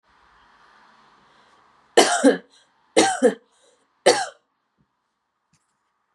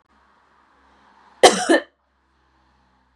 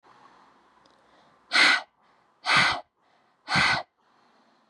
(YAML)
three_cough_length: 6.1 s
three_cough_amplitude: 31642
three_cough_signal_mean_std_ratio: 0.28
cough_length: 3.2 s
cough_amplitude: 32768
cough_signal_mean_std_ratio: 0.23
exhalation_length: 4.7 s
exhalation_amplitude: 15311
exhalation_signal_mean_std_ratio: 0.37
survey_phase: beta (2021-08-13 to 2022-03-07)
age: 18-44
gender: Female
wearing_mask: 'No'
symptom_fatigue: true
smoker_status: Never smoked
respiratory_condition_asthma: false
respiratory_condition_other: false
recruitment_source: REACT
submission_delay: 2 days
covid_test_result: Negative
covid_test_method: RT-qPCR
influenza_a_test_result: Unknown/Void
influenza_b_test_result: Unknown/Void